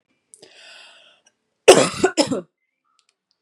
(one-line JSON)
{"cough_length": "3.4 s", "cough_amplitude": 32768, "cough_signal_mean_std_ratio": 0.26, "survey_phase": "beta (2021-08-13 to 2022-03-07)", "age": "18-44", "gender": "Female", "wearing_mask": "No", "symptom_cough_any": true, "symptom_runny_or_blocked_nose": true, "symptom_fatigue": true, "smoker_status": "Never smoked", "respiratory_condition_asthma": false, "respiratory_condition_other": false, "recruitment_source": "Test and Trace", "submission_delay": "2 days", "covid_test_result": "Positive", "covid_test_method": "RT-qPCR", "covid_ct_value": 27.2, "covid_ct_gene": "ORF1ab gene"}